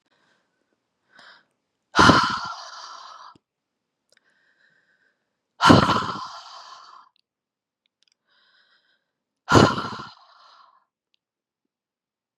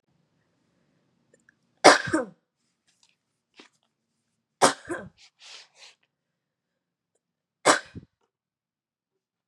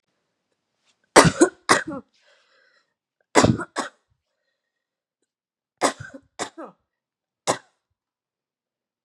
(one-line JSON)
{"exhalation_length": "12.4 s", "exhalation_amplitude": 32738, "exhalation_signal_mean_std_ratio": 0.25, "three_cough_length": "9.5 s", "three_cough_amplitude": 31460, "three_cough_signal_mean_std_ratio": 0.18, "cough_length": "9.0 s", "cough_amplitude": 32767, "cough_signal_mean_std_ratio": 0.22, "survey_phase": "beta (2021-08-13 to 2022-03-07)", "age": "18-44", "gender": "Female", "wearing_mask": "No", "symptom_none": true, "symptom_onset": "6 days", "smoker_status": "Current smoker (1 to 10 cigarettes per day)", "respiratory_condition_asthma": false, "respiratory_condition_other": false, "recruitment_source": "REACT", "submission_delay": "3 days", "covid_test_result": "Negative", "covid_test_method": "RT-qPCR", "influenza_a_test_result": "Unknown/Void", "influenza_b_test_result": "Unknown/Void"}